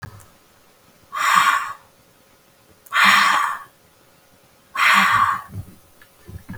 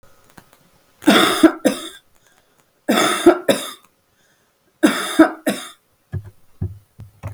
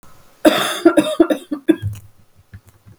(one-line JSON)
{"exhalation_length": "6.6 s", "exhalation_amplitude": 29080, "exhalation_signal_mean_std_ratio": 0.47, "three_cough_length": "7.3 s", "three_cough_amplitude": 32768, "three_cough_signal_mean_std_ratio": 0.37, "cough_length": "3.0 s", "cough_amplitude": 32768, "cough_signal_mean_std_ratio": 0.42, "survey_phase": "beta (2021-08-13 to 2022-03-07)", "age": "18-44", "gender": "Female", "wearing_mask": "No", "symptom_cough_any": true, "symptom_new_continuous_cough": true, "symptom_runny_or_blocked_nose": true, "symptom_shortness_of_breath": true, "symptom_sore_throat": true, "symptom_fever_high_temperature": true, "symptom_onset": "2 days", "smoker_status": "Never smoked", "respiratory_condition_asthma": false, "respiratory_condition_other": false, "recruitment_source": "Test and Trace", "submission_delay": "1 day", "covid_test_result": "Positive", "covid_test_method": "RT-qPCR", "covid_ct_value": 26.9, "covid_ct_gene": "ORF1ab gene", "covid_ct_mean": 27.1, "covid_viral_load": "1300 copies/ml", "covid_viral_load_category": "Minimal viral load (< 10K copies/ml)"}